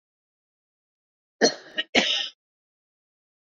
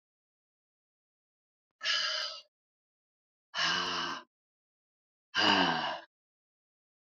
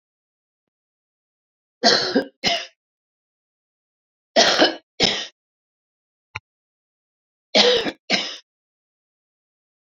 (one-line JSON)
{"cough_length": "3.6 s", "cough_amplitude": 20098, "cough_signal_mean_std_ratio": 0.27, "exhalation_length": "7.2 s", "exhalation_amplitude": 7910, "exhalation_signal_mean_std_ratio": 0.39, "three_cough_length": "9.9 s", "three_cough_amplitude": 30225, "three_cough_signal_mean_std_ratio": 0.31, "survey_phase": "beta (2021-08-13 to 2022-03-07)", "age": "45-64", "gender": "Female", "wearing_mask": "No", "symptom_cough_any": true, "symptom_new_continuous_cough": true, "symptom_runny_or_blocked_nose": true, "symptom_shortness_of_breath": true, "symptom_sore_throat": true, "symptom_abdominal_pain": true, "symptom_fatigue": true, "symptom_fever_high_temperature": true, "symptom_headache": true, "symptom_other": true, "symptom_onset": "3 days", "smoker_status": "Current smoker (1 to 10 cigarettes per day)", "respiratory_condition_asthma": false, "respiratory_condition_other": false, "recruitment_source": "Test and Trace", "submission_delay": "2 days", "covid_test_result": "Positive", "covid_test_method": "RT-qPCR", "covid_ct_value": 19.8, "covid_ct_gene": "ORF1ab gene"}